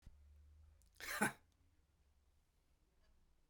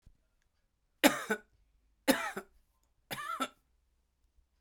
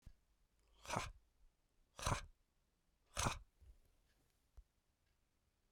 {"cough_length": "3.5 s", "cough_amplitude": 2485, "cough_signal_mean_std_ratio": 0.27, "three_cough_length": "4.6 s", "three_cough_amplitude": 13630, "three_cough_signal_mean_std_ratio": 0.26, "exhalation_length": "5.7 s", "exhalation_amplitude": 2182, "exhalation_signal_mean_std_ratio": 0.29, "survey_phase": "beta (2021-08-13 to 2022-03-07)", "age": "45-64", "gender": "Male", "wearing_mask": "No", "symptom_headache": true, "symptom_onset": "12 days", "smoker_status": "Ex-smoker", "respiratory_condition_asthma": false, "respiratory_condition_other": false, "recruitment_source": "REACT", "submission_delay": "2 days", "covid_test_result": "Negative", "covid_test_method": "RT-qPCR", "covid_ct_value": 37.0, "covid_ct_gene": "N gene"}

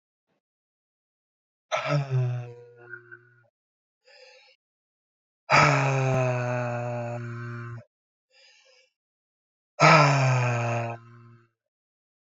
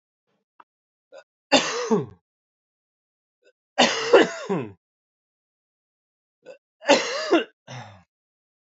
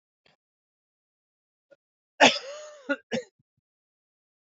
{"exhalation_length": "12.2 s", "exhalation_amplitude": 22047, "exhalation_signal_mean_std_ratio": 0.44, "three_cough_length": "8.7 s", "three_cough_amplitude": 26911, "three_cough_signal_mean_std_ratio": 0.31, "cough_length": "4.5 s", "cough_amplitude": 26514, "cough_signal_mean_std_ratio": 0.19, "survey_phase": "beta (2021-08-13 to 2022-03-07)", "age": "18-44", "gender": "Male", "wearing_mask": "No", "symptom_cough_any": true, "symptom_change_to_sense_of_smell_or_taste": true, "symptom_loss_of_taste": true, "symptom_other": true, "symptom_onset": "3 days", "smoker_status": "Ex-smoker", "respiratory_condition_asthma": false, "respiratory_condition_other": false, "recruitment_source": "Test and Trace", "submission_delay": "1 day", "covid_test_result": "Positive", "covid_test_method": "RT-qPCR", "covid_ct_value": 17.6, "covid_ct_gene": "ORF1ab gene", "covid_ct_mean": 17.9, "covid_viral_load": "1300000 copies/ml", "covid_viral_load_category": "High viral load (>1M copies/ml)"}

